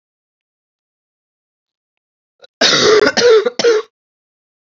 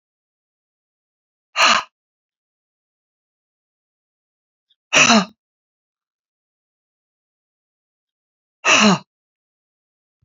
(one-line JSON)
{"cough_length": "4.7 s", "cough_amplitude": 32768, "cough_signal_mean_std_ratio": 0.4, "exhalation_length": "10.2 s", "exhalation_amplitude": 31054, "exhalation_signal_mean_std_ratio": 0.23, "survey_phase": "beta (2021-08-13 to 2022-03-07)", "age": "65+", "gender": "Female", "wearing_mask": "No", "symptom_cough_any": true, "symptom_runny_or_blocked_nose": true, "symptom_other": true, "symptom_onset": "6 days", "smoker_status": "Ex-smoker", "respiratory_condition_asthma": false, "respiratory_condition_other": false, "recruitment_source": "Test and Trace", "submission_delay": "3 days", "covid_test_result": "Positive", "covid_test_method": "RT-qPCR", "covid_ct_value": 20.7, "covid_ct_gene": "ORF1ab gene", "covid_ct_mean": 21.4, "covid_viral_load": "95000 copies/ml", "covid_viral_load_category": "Low viral load (10K-1M copies/ml)"}